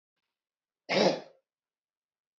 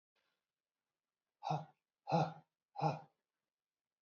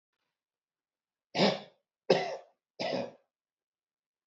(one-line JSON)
{"cough_length": "2.4 s", "cough_amplitude": 9210, "cough_signal_mean_std_ratio": 0.27, "exhalation_length": "4.0 s", "exhalation_amplitude": 2930, "exhalation_signal_mean_std_ratio": 0.3, "three_cough_length": "4.3 s", "three_cough_amplitude": 11340, "three_cough_signal_mean_std_ratio": 0.3, "survey_phase": "beta (2021-08-13 to 2022-03-07)", "age": "45-64", "gender": "Male", "wearing_mask": "No", "symptom_none": true, "smoker_status": "Ex-smoker", "respiratory_condition_asthma": false, "respiratory_condition_other": false, "recruitment_source": "REACT", "submission_delay": "4 days", "covid_test_result": "Negative", "covid_test_method": "RT-qPCR", "influenza_a_test_result": "Negative", "influenza_b_test_result": "Negative"}